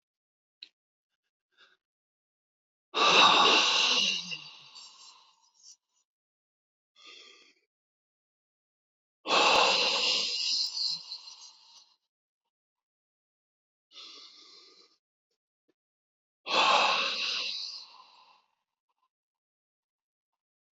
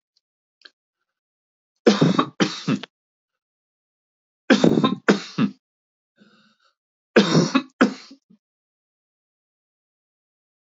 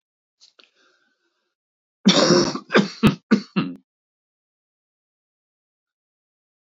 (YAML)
exhalation_length: 20.7 s
exhalation_amplitude: 13626
exhalation_signal_mean_std_ratio: 0.36
three_cough_length: 10.8 s
three_cough_amplitude: 26949
three_cough_signal_mean_std_ratio: 0.3
cough_length: 6.7 s
cough_amplitude: 25266
cough_signal_mean_std_ratio: 0.29
survey_phase: beta (2021-08-13 to 2022-03-07)
age: 65+
gender: Male
wearing_mask: 'No'
symptom_none: true
smoker_status: Ex-smoker
respiratory_condition_asthma: false
respiratory_condition_other: false
recruitment_source: REACT
submission_delay: 1 day
covid_test_result: Negative
covid_test_method: RT-qPCR
influenza_a_test_result: Negative
influenza_b_test_result: Negative